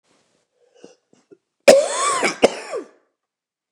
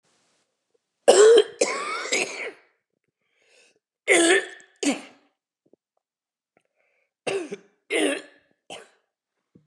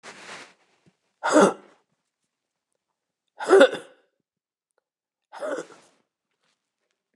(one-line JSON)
{"cough_length": "3.7 s", "cough_amplitude": 29204, "cough_signal_mean_std_ratio": 0.32, "three_cough_length": "9.7 s", "three_cough_amplitude": 27501, "three_cough_signal_mean_std_ratio": 0.33, "exhalation_length": "7.2 s", "exhalation_amplitude": 28046, "exhalation_signal_mean_std_ratio": 0.24, "survey_phase": "beta (2021-08-13 to 2022-03-07)", "age": "45-64", "gender": "Male", "wearing_mask": "No", "symptom_cough_any": true, "symptom_shortness_of_breath": true, "symptom_sore_throat": true, "symptom_diarrhoea": true, "symptom_fatigue": true, "symptom_onset": "5 days", "smoker_status": "Never smoked", "respiratory_condition_asthma": false, "respiratory_condition_other": false, "recruitment_source": "Test and Trace", "submission_delay": "2 days", "covid_test_result": "Positive", "covid_test_method": "ePCR"}